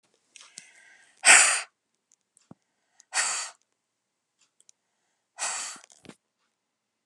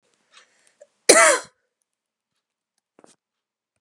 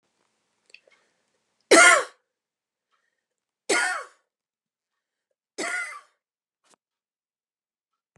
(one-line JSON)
{"exhalation_length": "7.1 s", "exhalation_amplitude": 29253, "exhalation_signal_mean_std_ratio": 0.23, "cough_length": "3.8 s", "cough_amplitude": 32768, "cough_signal_mean_std_ratio": 0.22, "three_cough_length": "8.2 s", "three_cough_amplitude": 24880, "three_cough_signal_mean_std_ratio": 0.22, "survey_phase": "beta (2021-08-13 to 2022-03-07)", "age": "45-64", "gender": "Female", "wearing_mask": "No", "symptom_none": true, "smoker_status": "Current smoker (e-cigarettes or vapes only)", "respiratory_condition_asthma": false, "respiratory_condition_other": false, "recruitment_source": "REACT", "submission_delay": "2 days", "covid_test_result": "Negative", "covid_test_method": "RT-qPCR"}